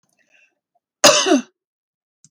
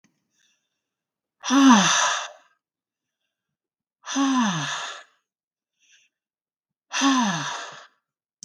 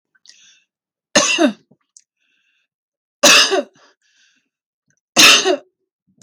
{"cough_length": "2.3 s", "cough_amplitude": 32768, "cough_signal_mean_std_ratio": 0.3, "exhalation_length": "8.4 s", "exhalation_amplitude": 23659, "exhalation_signal_mean_std_ratio": 0.39, "three_cough_length": "6.2 s", "three_cough_amplitude": 32768, "three_cough_signal_mean_std_ratio": 0.33, "survey_phase": "beta (2021-08-13 to 2022-03-07)", "age": "45-64", "gender": "Female", "wearing_mask": "No", "symptom_sore_throat": true, "symptom_onset": "4 days", "smoker_status": "Ex-smoker", "respiratory_condition_asthma": false, "respiratory_condition_other": false, "recruitment_source": "REACT", "submission_delay": "3 days", "covid_test_result": "Negative", "covid_test_method": "RT-qPCR", "influenza_a_test_result": "Negative", "influenza_b_test_result": "Negative"}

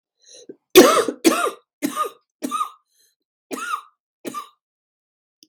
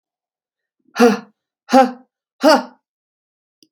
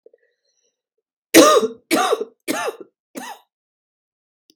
{"cough_length": "5.5 s", "cough_amplitude": 32768, "cough_signal_mean_std_ratio": 0.31, "exhalation_length": "3.7 s", "exhalation_amplitude": 32768, "exhalation_signal_mean_std_ratio": 0.3, "three_cough_length": "4.6 s", "three_cough_amplitude": 32768, "three_cough_signal_mean_std_ratio": 0.32, "survey_phase": "beta (2021-08-13 to 2022-03-07)", "age": "45-64", "gender": "Female", "wearing_mask": "No", "symptom_cough_any": true, "symptom_runny_or_blocked_nose": true, "symptom_shortness_of_breath": true, "symptom_sore_throat": true, "symptom_abdominal_pain": true, "symptom_fatigue": true, "symptom_fever_high_temperature": true, "symptom_onset": "4 days", "smoker_status": "Never smoked", "respiratory_condition_asthma": false, "respiratory_condition_other": false, "recruitment_source": "Test and Trace", "submission_delay": "2 days", "covid_test_result": "Positive", "covid_test_method": "ePCR"}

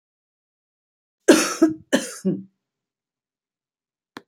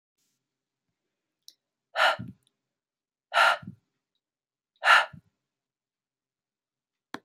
{"cough_length": "4.3 s", "cough_amplitude": 27455, "cough_signal_mean_std_ratio": 0.27, "exhalation_length": "7.2 s", "exhalation_amplitude": 16331, "exhalation_signal_mean_std_ratio": 0.23, "survey_phase": "beta (2021-08-13 to 2022-03-07)", "age": "65+", "gender": "Female", "wearing_mask": "No", "symptom_none": true, "symptom_onset": "4 days", "smoker_status": "Never smoked", "respiratory_condition_asthma": false, "respiratory_condition_other": false, "recruitment_source": "REACT", "submission_delay": "1 day", "covid_test_result": "Negative", "covid_test_method": "RT-qPCR"}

